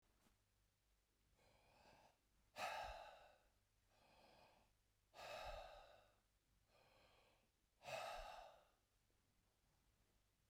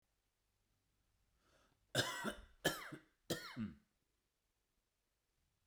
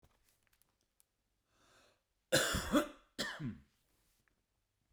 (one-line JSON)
{"exhalation_length": "10.5 s", "exhalation_amplitude": 514, "exhalation_signal_mean_std_ratio": 0.43, "three_cough_length": "5.7 s", "three_cough_amplitude": 2771, "three_cough_signal_mean_std_ratio": 0.31, "cough_length": "4.9 s", "cough_amplitude": 4736, "cough_signal_mean_std_ratio": 0.3, "survey_phase": "beta (2021-08-13 to 2022-03-07)", "age": "45-64", "gender": "Male", "wearing_mask": "No", "symptom_none": true, "smoker_status": "Never smoked", "respiratory_condition_asthma": false, "respiratory_condition_other": false, "recruitment_source": "REACT", "submission_delay": "2 days", "covid_test_result": "Negative", "covid_test_method": "RT-qPCR", "influenza_a_test_result": "Negative", "influenza_b_test_result": "Negative"}